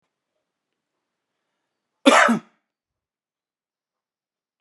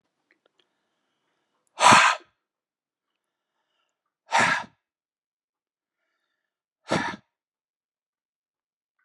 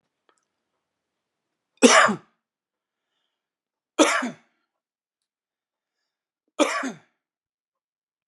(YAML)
cough_length: 4.6 s
cough_amplitude: 31906
cough_signal_mean_std_ratio: 0.2
exhalation_length: 9.0 s
exhalation_amplitude: 26887
exhalation_signal_mean_std_ratio: 0.22
three_cough_length: 8.3 s
three_cough_amplitude: 31741
three_cough_signal_mean_std_ratio: 0.23
survey_phase: alpha (2021-03-01 to 2021-08-12)
age: 45-64
gender: Male
wearing_mask: 'No'
symptom_none: true
smoker_status: Ex-smoker
respiratory_condition_asthma: false
respiratory_condition_other: false
recruitment_source: REACT
submission_delay: 1 day
covid_test_result: Negative
covid_test_method: RT-qPCR